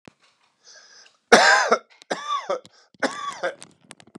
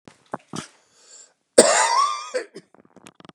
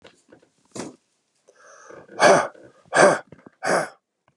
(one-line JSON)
{"three_cough_length": "4.2 s", "three_cough_amplitude": 32768, "three_cough_signal_mean_std_ratio": 0.36, "cough_length": "3.3 s", "cough_amplitude": 32768, "cough_signal_mean_std_ratio": 0.35, "exhalation_length": "4.4 s", "exhalation_amplitude": 29979, "exhalation_signal_mean_std_ratio": 0.33, "survey_phase": "beta (2021-08-13 to 2022-03-07)", "age": "45-64", "gender": "Male", "wearing_mask": "No", "symptom_none": true, "smoker_status": "Never smoked", "respiratory_condition_asthma": false, "respiratory_condition_other": false, "recruitment_source": "REACT", "submission_delay": "3 days", "covid_test_result": "Negative", "covid_test_method": "RT-qPCR", "influenza_a_test_result": "Positive", "influenza_a_ct_value": 36.9, "influenza_b_test_result": "Positive", "influenza_b_ct_value": 36.5}